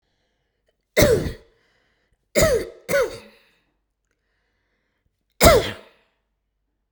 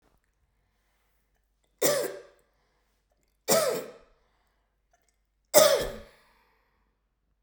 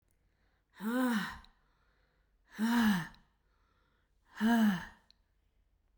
{"cough_length": "6.9 s", "cough_amplitude": 32767, "cough_signal_mean_std_ratio": 0.31, "three_cough_length": "7.4 s", "three_cough_amplitude": 22935, "three_cough_signal_mean_std_ratio": 0.27, "exhalation_length": "6.0 s", "exhalation_amplitude": 3909, "exhalation_signal_mean_std_ratio": 0.44, "survey_phase": "beta (2021-08-13 to 2022-03-07)", "age": "45-64", "gender": "Female", "wearing_mask": "No", "symptom_none": true, "smoker_status": "Never smoked", "respiratory_condition_asthma": false, "respiratory_condition_other": false, "recruitment_source": "REACT", "submission_delay": "0 days", "covid_test_result": "Negative", "covid_test_method": "RT-qPCR", "influenza_a_test_result": "Negative", "influenza_b_test_result": "Negative"}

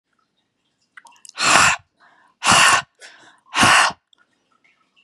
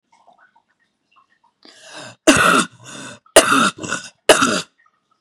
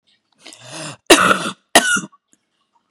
{"exhalation_length": "5.0 s", "exhalation_amplitude": 32767, "exhalation_signal_mean_std_ratio": 0.39, "three_cough_length": "5.2 s", "three_cough_amplitude": 32768, "three_cough_signal_mean_std_ratio": 0.37, "cough_length": "2.9 s", "cough_amplitude": 32768, "cough_signal_mean_std_ratio": 0.36, "survey_phase": "beta (2021-08-13 to 2022-03-07)", "age": "18-44", "gender": "Female", "wearing_mask": "No", "symptom_cough_any": true, "symptom_runny_or_blocked_nose": true, "symptom_sore_throat": true, "symptom_fever_high_temperature": true, "symptom_headache": true, "symptom_onset": "2 days", "smoker_status": "Never smoked", "respiratory_condition_asthma": false, "respiratory_condition_other": false, "recruitment_source": "Test and Trace", "submission_delay": "0 days", "covid_test_result": "Positive", "covid_test_method": "RT-qPCR", "covid_ct_value": 24.4, "covid_ct_gene": "N gene"}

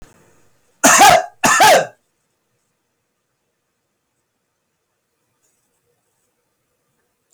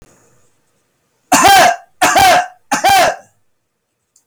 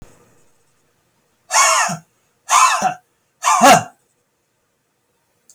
{"cough_length": "7.3 s", "cough_amplitude": 32768, "cough_signal_mean_std_ratio": 0.29, "three_cough_length": "4.3 s", "three_cough_amplitude": 32766, "three_cough_signal_mean_std_ratio": 0.53, "exhalation_length": "5.5 s", "exhalation_amplitude": 31371, "exhalation_signal_mean_std_ratio": 0.38, "survey_phase": "beta (2021-08-13 to 2022-03-07)", "age": "45-64", "gender": "Male", "wearing_mask": "No", "symptom_cough_any": true, "smoker_status": "Never smoked", "respiratory_condition_asthma": false, "respiratory_condition_other": false, "recruitment_source": "REACT", "submission_delay": "1 day", "covid_test_result": "Negative", "covid_test_method": "RT-qPCR", "influenza_a_test_result": "Negative", "influenza_b_test_result": "Negative"}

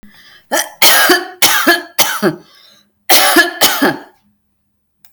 {"cough_length": "5.1 s", "cough_amplitude": 32768, "cough_signal_mean_std_ratio": 0.54, "survey_phase": "alpha (2021-03-01 to 2021-08-12)", "age": "45-64", "gender": "Female", "wearing_mask": "No", "symptom_none": true, "smoker_status": "Ex-smoker", "respiratory_condition_asthma": false, "respiratory_condition_other": false, "recruitment_source": "REACT", "submission_delay": "1 day", "covid_test_result": "Negative", "covid_test_method": "RT-qPCR"}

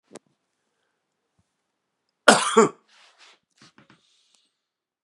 {"cough_length": "5.0 s", "cough_amplitude": 32768, "cough_signal_mean_std_ratio": 0.19, "survey_phase": "beta (2021-08-13 to 2022-03-07)", "age": "45-64", "gender": "Male", "wearing_mask": "No", "symptom_cough_any": true, "symptom_runny_or_blocked_nose": true, "symptom_sore_throat": true, "symptom_abdominal_pain": true, "symptom_fatigue": true, "symptom_onset": "3 days", "smoker_status": "Never smoked", "respiratory_condition_asthma": false, "respiratory_condition_other": false, "recruitment_source": "Test and Trace", "submission_delay": "2 days", "covid_test_result": "Positive", "covid_test_method": "RT-qPCR", "covid_ct_value": 19.3, "covid_ct_gene": "ORF1ab gene", "covid_ct_mean": 19.3, "covid_viral_load": "460000 copies/ml", "covid_viral_load_category": "Low viral load (10K-1M copies/ml)"}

